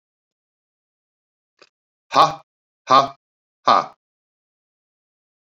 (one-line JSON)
{"exhalation_length": "5.5 s", "exhalation_amplitude": 28567, "exhalation_signal_mean_std_ratio": 0.22, "survey_phase": "beta (2021-08-13 to 2022-03-07)", "age": "45-64", "gender": "Male", "wearing_mask": "No", "symptom_none": true, "smoker_status": "Current smoker (1 to 10 cigarettes per day)", "respiratory_condition_asthma": false, "respiratory_condition_other": false, "recruitment_source": "REACT", "submission_delay": "1 day", "covid_test_result": "Negative", "covid_test_method": "RT-qPCR"}